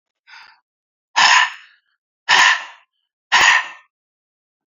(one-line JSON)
{"exhalation_length": "4.7 s", "exhalation_amplitude": 32478, "exhalation_signal_mean_std_ratio": 0.38, "survey_phase": "beta (2021-08-13 to 2022-03-07)", "age": "65+", "gender": "Male", "wearing_mask": "No", "symptom_none": true, "smoker_status": "Ex-smoker", "respiratory_condition_asthma": false, "respiratory_condition_other": false, "recruitment_source": "REACT", "submission_delay": "2 days", "covid_test_result": "Negative", "covid_test_method": "RT-qPCR"}